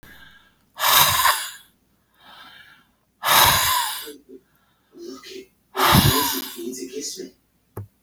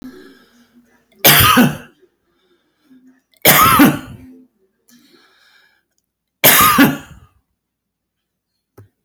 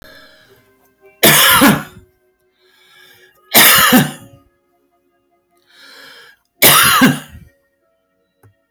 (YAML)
exhalation_length: 8.0 s
exhalation_amplitude: 32767
exhalation_signal_mean_std_ratio: 0.46
three_cough_length: 9.0 s
three_cough_amplitude: 32768
three_cough_signal_mean_std_ratio: 0.36
cough_length: 8.7 s
cough_amplitude: 32768
cough_signal_mean_std_ratio: 0.39
survey_phase: alpha (2021-03-01 to 2021-08-12)
age: 65+
gender: Male
wearing_mask: 'No'
symptom_none: true
smoker_status: Ex-smoker
respiratory_condition_asthma: false
respiratory_condition_other: false
recruitment_source: REACT
submission_delay: 1 day
covid_test_result: Negative
covid_test_method: RT-qPCR